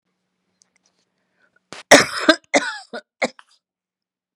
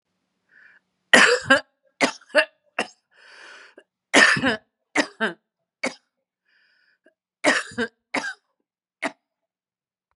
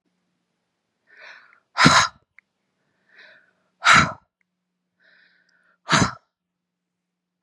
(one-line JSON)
{"cough_length": "4.4 s", "cough_amplitude": 32768, "cough_signal_mean_std_ratio": 0.24, "three_cough_length": "10.2 s", "three_cough_amplitude": 32768, "three_cough_signal_mean_std_ratio": 0.3, "exhalation_length": "7.4 s", "exhalation_amplitude": 32767, "exhalation_signal_mean_std_ratio": 0.25, "survey_phase": "beta (2021-08-13 to 2022-03-07)", "age": "45-64", "gender": "Female", "wearing_mask": "No", "symptom_none": true, "smoker_status": "Never smoked", "respiratory_condition_asthma": false, "respiratory_condition_other": false, "recruitment_source": "REACT", "submission_delay": "2 days", "covid_test_result": "Negative", "covid_test_method": "RT-qPCR", "influenza_a_test_result": "Negative", "influenza_b_test_result": "Negative"}